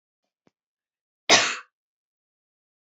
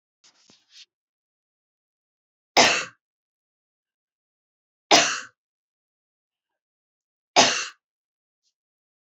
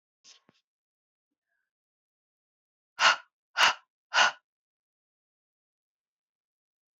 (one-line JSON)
{"cough_length": "3.0 s", "cough_amplitude": 25226, "cough_signal_mean_std_ratio": 0.21, "three_cough_length": "9.0 s", "three_cough_amplitude": 26015, "three_cough_signal_mean_std_ratio": 0.22, "exhalation_length": "7.0 s", "exhalation_amplitude": 14945, "exhalation_signal_mean_std_ratio": 0.2, "survey_phase": "beta (2021-08-13 to 2022-03-07)", "age": "45-64", "gender": "Female", "wearing_mask": "No", "symptom_none": true, "smoker_status": "Never smoked", "respiratory_condition_asthma": true, "respiratory_condition_other": false, "recruitment_source": "Test and Trace", "submission_delay": "1 day", "covid_test_result": "Negative", "covid_test_method": "RT-qPCR"}